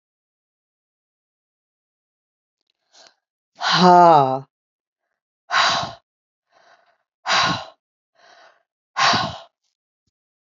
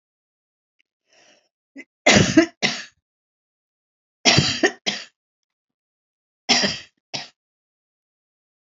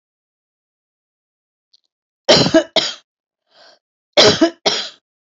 {
  "exhalation_length": "10.5 s",
  "exhalation_amplitude": 28878,
  "exhalation_signal_mean_std_ratio": 0.3,
  "three_cough_length": "8.7 s",
  "three_cough_amplitude": 30454,
  "three_cough_signal_mean_std_ratio": 0.28,
  "cough_length": "5.4 s",
  "cough_amplitude": 30830,
  "cough_signal_mean_std_ratio": 0.32,
  "survey_phase": "alpha (2021-03-01 to 2021-08-12)",
  "age": "65+",
  "gender": "Female",
  "wearing_mask": "No",
  "symptom_none": true,
  "smoker_status": "Never smoked",
  "respiratory_condition_asthma": false,
  "respiratory_condition_other": false,
  "recruitment_source": "REACT",
  "submission_delay": "2 days",
  "covid_test_result": "Negative",
  "covid_test_method": "RT-qPCR",
  "covid_ct_value": 41.0,
  "covid_ct_gene": "N gene"
}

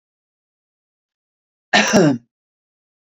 {
  "cough_length": "3.2 s",
  "cough_amplitude": 27912,
  "cough_signal_mean_std_ratio": 0.29,
  "survey_phase": "beta (2021-08-13 to 2022-03-07)",
  "age": "45-64",
  "gender": "Female",
  "wearing_mask": "No",
  "symptom_none": true,
  "smoker_status": "Never smoked",
  "respiratory_condition_asthma": false,
  "respiratory_condition_other": true,
  "recruitment_source": "REACT",
  "submission_delay": "3 days",
  "covid_test_result": "Negative",
  "covid_test_method": "RT-qPCR",
  "influenza_a_test_result": "Negative",
  "influenza_b_test_result": "Negative"
}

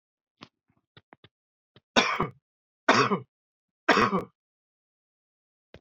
{
  "three_cough_length": "5.8 s",
  "three_cough_amplitude": 19406,
  "three_cough_signal_mean_std_ratio": 0.29,
  "survey_phase": "beta (2021-08-13 to 2022-03-07)",
  "age": "65+",
  "gender": "Male",
  "wearing_mask": "No",
  "symptom_cough_any": true,
  "symptom_runny_or_blocked_nose": true,
  "symptom_sore_throat": true,
  "symptom_fatigue": true,
  "symptom_fever_high_temperature": true,
  "symptom_onset": "2 days",
  "smoker_status": "Ex-smoker",
  "respiratory_condition_asthma": false,
  "respiratory_condition_other": false,
  "recruitment_source": "Test and Trace",
  "submission_delay": "1 day",
  "covid_test_result": "Positive",
  "covid_test_method": "RT-qPCR",
  "covid_ct_value": 16.5,
  "covid_ct_gene": "ORF1ab gene",
  "covid_ct_mean": 17.5,
  "covid_viral_load": "1800000 copies/ml",
  "covid_viral_load_category": "High viral load (>1M copies/ml)"
}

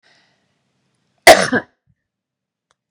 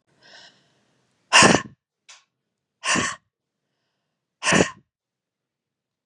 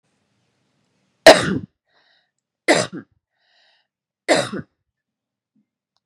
{
  "cough_length": "2.9 s",
  "cough_amplitude": 32768,
  "cough_signal_mean_std_ratio": 0.22,
  "exhalation_length": "6.1 s",
  "exhalation_amplitude": 30894,
  "exhalation_signal_mean_std_ratio": 0.26,
  "three_cough_length": "6.1 s",
  "three_cough_amplitude": 32768,
  "three_cough_signal_mean_std_ratio": 0.22,
  "survey_phase": "beta (2021-08-13 to 2022-03-07)",
  "age": "45-64",
  "gender": "Female",
  "wearing_mask": "No",
  "symptom_none": true,
  "smoker_status": "Ex-smoker",
  "respiratory_condition_asthma": false,
  "respiratory_condition_other": false,
  "recruitment_source": "REACT",
  "submission_delay": "1 day",
  "covid_test_result": "Negative",
  "covid_test_method": "RT-qPCR",
  "influenza_a_test_result": "Negative",
  "influenza_b_test_result": "Negative"
}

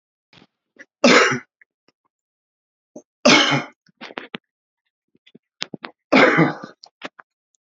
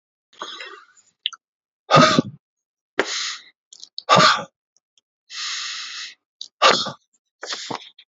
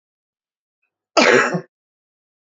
{
  "three_cough_length": "7.8 s",
  "three_cough_amplitude": 32214,
  "three_cough_signal_mean_std_ratio": 0.31,
  "exhalation_length": "8.2 s",
  "exhalation_amplitude": 29488,
  "exhalation_signal_mean_std_ratio": 0.34,
  "cough_length": "2.6 s",
  "cough_amplitude": 29361,
  "cough_signal_mean_std_ratio": 0.31,
  "survey_phase": "beta (2021-08-13 to 2022-03-07)",
  "age": "45-64",
  "gender": "Male",
  "wearing_mask": "No",
  "symptom_sore_throat": true,
  "symptom_headache": true,
  "symptom_loss_of_taste": true,
  "symptom_onset": "6 days",
  "smoker_status": "Ex-smoker",
  "recruitment_source": "Test and Trace",
  "submission_delay": "2 days",
  "covid_test_result": "Positive",
  "covid_test_method": "RT-qPCR",
  "covid_ct_value": 19.7,
  "covid_ct_gene": "ORF1ab gene"
}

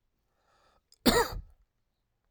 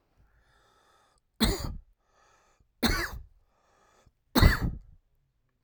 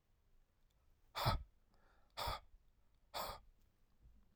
{
  "cough_length": "2.3 s",
  "cough_amplitude": 12039,
  "cough_signal_mean_std_ratio": 0.27,
  "three_cough_length": "5.6 s",
  "three_cough_amplitude": 19041,
  "three_cough_signal_mean_std_ratio": 0.29,
  "exhalation_length": "4.4 s",
  "exhalation_amplitude": 2582,
  "exhalation_signal_mean_std_ratio": 0.35,
  "survey_phase": "alpha (2021-03-01 to 2021-08-12)",
  "age": "18-44",
  "gender": "Male",
  "wearing_mask": "No",
  "symptom_cough_any": true,
  "symptom_fatigue": true,
  "symptom_fever_high_temperature": true,
  "symptom_headache": true,
  "symptom_change_to_sense_of_smell_or_taste": true,
  "symptom_loss_of_taste": true,
  "symptom_onset": "2 days",
  "smoker_status": "Never smoked",
  "respiratory_condition_asthma": false,
  "respiratory_condition_other": false,
  "recruitment_source": "Test and Trace",
  "submission_delay": "2 days",
  "covid_test_result": "Positive",
  "covid_test_method": "RT-qPCR",
  "covid_ct_value": 13.6,
  "covid_ct_gene": "ORF1ab gene",
  "covid_ct_mean": 13.9,
  "covid_viral_load": "28000000 copies/ml",
  "covid_viral_load_category": "High viral load (>1M copies/ml)"
}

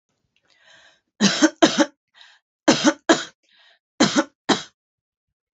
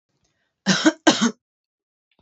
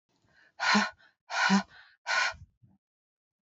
{
  "three_cough_length": "5.5 s",
  "three_cough_amplitude": 28593,
  "three_cough_signal_mean_std_ratio": 0.34,
  "cough_length": "2.2 s",
  "cough_amplitude": 29002,
  "cough_signal_mean_std_ratio": 0.33,
  "exhalation_length": "3.4 s",
  "exhalation_amplitude": 7983,
  "exhalation_signal_mean_std_ratio": 0.41,
  "survey_phase": "beta (2021-08-13 to 2022-03-07)",
  "age": "45-64",
  "gender": "Female",
  "wearing_mask": "No",
  "symptom_none": true,
  "smoker_status": "Never smoked",
  "respiratory_condition_asthma": false,
  "respiratory_condition_other": false,
  "recruitment_source": "Test and Trace",
  "submission_delay": "0 days",
  "covid_test_result": "Negative",
  "covid_test_method": "LFT"
}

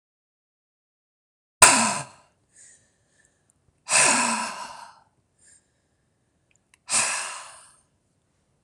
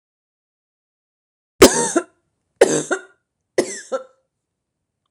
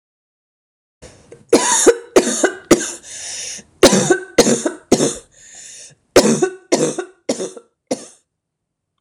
{
  "exhalation_length": "8.6 s",
  "exhalation_amplitude": 26028,
  "exhalation_signal_mean_std_ratio": 0.29,
  "three_cough_length": "5.1 s",
  "three_cough_amplitude": 26028,
  "three_cough_signal_mean_std_ratio": 0.26,
  "cough_length": "9.0 s",
  "cough_amplitude": 26028,
  "cough_signal_mean_std_ratio": 0.42,
  "survey_phase": "alpha (2021-03-01 to 2021-08-12)",
  "age": "45-64",
  "gender": "Female",
  "wearing_mask": "No",
  "symptom_change_to_sense_of_smell_or_taste": true,
  "symptom_onset": "12 days",
  "smoker_status": "Never smoked",
  "respiratory_condition_asthma": false,
  "respiratory_condition_other": false,
  "recruitment_source": "REACT",
  "submission_delay": "1 day",
  "covid_test_result": "Negative",
  "covid_test_method": "RT-qPCR"
}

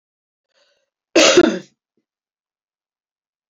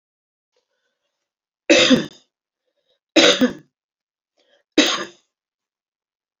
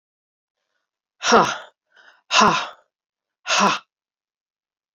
{
  "cough_length": "3.5 s",
  "cough_amplitude": 31373,
  "cough_signal_mean_std_ratio": 0.26,
  "three_cough_length": "6.4 s",
  "three_cough_amplitude": 32767,
  "three_cough_signal_mean_std_ratio": 0.29,
  "exhalation_length": "4.9 s",
  "exhalation_amplitude": 31601,
  "exhalation_signal_mean_std_ratio": 0.33,
  "survey_phase": "beta (2021-08-13 to 2022-03-07)",
  "age": "65+",
  "gender": "Female",
  "wearing_mask": "No",
  "symptom_cough_any": true,
  "symptom_sore_throat": true,
  "symptom_onset": "6 days",
  "smoker_status": "Ex-smoker",
  "respiratory_condition_asthma": false,
  "respiratory_condition_other": false,
  "recruitment_source": "Test and Trace",
  "submission_delay": "2 days",
  "covid_test_result": "Positive",
  "covid_test_method": "RT-qPCR",
  "covid_ct_value": 23.6,
  "covid_ct_gene": "ORF1ab gene"
}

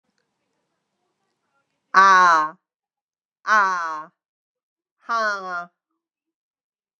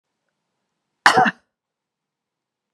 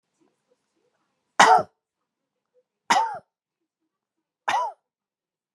{
  "exhalation_length": "7.0 s",
  "exhalation_amplitude": 30799,
  "exhalation_signal_mean_std_ratio": 0.33,
  "cough_length": "2.7 s",
  "cough_amplitude": 32768,
  "cough_signal_mean_std_ratio": 0.22,
  "three_cough_length": "5.5 s",
  "three_cough_amplitude": 31208,
  "three_cough_signal_mean_std_ratio": 0.25,
  "survey_phase": "beta (2021-08-13 to 2022-03-07)",
  "age": "45-64",
  "gender": "Female",
  "wearing_mask": "No",
  "symptom_sore_throat": true,
  "symptom_onset": "4 days",
  "smoker_status": "Never smoked",
  "respiratory_condition_asthma": false,
  "respiratory_condition_other": false,
  "recruitment_source": "Test and Trace",
  "submission_delay": "2 days",
  "covid_test_result": "Positive",
  "covid_test_method": "RT-qPCR",
  "covid_ct_value": 12.8,
  "covid_ct_gene": "ORF1ab gene",
  "covid_ct_mean": 13.0,
  "covid_viral_load": "56000000 copies/ml",
  "covid_viral_load_category": "High viral load (>1M copies/ml)"
}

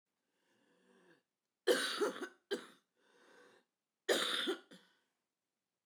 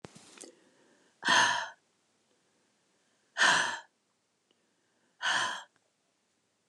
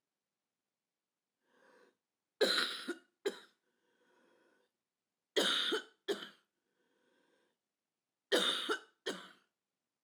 {
  "cough_length": "5.9 s",
  "cough_amplitude": 3713,
  "cough_signal_mean_std_ratio": 0.34,
  "exhalation_length": "6.7 s",
  "exhalation_amplitude": 8007,
  "exhalation_signal_mean_std_ratio": 0.33,
  "three_cough_length": "10.0 s",
  "three_cough_amplitude": 4117,
  "three_cough_signal_mean_std_ratio": 0.32,
  "survey_phase": "alpha (2021-03-01 to 2021-08-12)",
  "age": "65+",
  "gender": "Female",
  "wearing_mask": "No",
  "symptom_cough_any": true,
  "symptom_headache": true,
  "smoker_status": "Never smoked",
  "respiratory_condition_asthma": false,
  "respiratory_condition_other": false,
  "recruitment_source": "REACT",
  "submission_delay": "1 day",
  "covid_test_result": "Negative",
  "covid_test_method": "RT-qPCR"
}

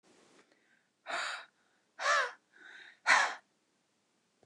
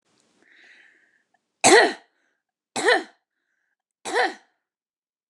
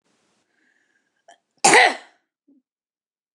{
  "exhalation_length": "4.5 s",
  "exhalation_amplitude": 8812,
  "exhalation_signal_mean_std_ratio": 0.33,
  "three_cough_length": "5.3 s",
  "three_cough_amplitude": 28552,
  "three_cough_signal_mean_std_ratio": 0.28,
  "cough_length": "3.3 s",
  "cough_amplitude": 28744,
  "cough_signal_mean_std_ratio": 0.23,
  "survey_phase": "beta (2021-08-13 to 2022-03-07)",
  "age": "45-64",
  "gender": "Female",
  "wearing_mask": "No",
  "symptom_none": true,
  "symptom_onset": "12 days",
  "smoker_status": "Never smoked",
  "respiratory_condition_asthma": true,
  "respiratory_condition_other": false,
  "recruitment_source": "REACT",
  "submission_delay": "5 days",
  "covid_test_result": "Negative",
  "covid_test_method": "RT-qPCR",
  "influenza_a_test_result": "Negative",
  "influenza_b_test_result": "Negative"
}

